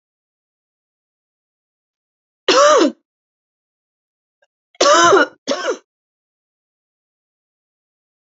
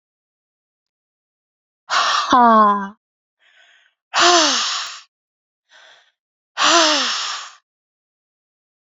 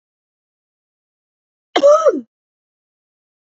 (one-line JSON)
{"three_cough_length": "8.4 s", "three_cough_amplitude": 29794, "three_cough_signal_mean_std_ratio": 0.29, "exhalation_length": "8.9 s", "exhalation_amplitude": 30098, "exhalation_signal_mean_std_ratio": 0.41, "cough_length": "3.5 s", "cough_amplitude": 29865, "cough_signal_mean_std_ratio": 0.27, "survey_phase": "beta (2021-08-13 to 2022-03-07)", "age": "65+", "gender": "Female", "wearing_mask": "No", "symptom_runny_or_blocked_nose": true, "symptom_onset": "12 days", "smoker_status": "Never smoked", "respiratory_condition_asthma": false, "respiratory_condition_other": false, "recruitment_source": "REACT", "submission_delay": "1 day", "covid_test_result": "Positive", "covid_test_method": "RT-qPCR", "covid_ct_value": 33.0, "covid_ct_gene": "E gene", "influenza_a_test_result": "Negative", "influenza_b_test_result": "Negative"}